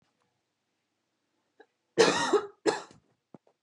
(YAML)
cough_length: 3.6 s
cough_amplitude: 15052
cough_signal_mean_std_ratio: 0.3
survey_phase: beta (2021-08-13 to 2022-03-07)
age: 18-44
gender: Female
wearing_mask: 'No'
symptom_shortness_of_breath: true
smoker_status: Never smoked
respiratory_condition_asthma: false
respiratory_condition_other: false
recruitment_source: REACT
submission_delay: 3 days
covid_test_result: Negative
covid_test_method: RT-qPCR
influenza_a_test_result: Negative
influenza_b_test_result: Negative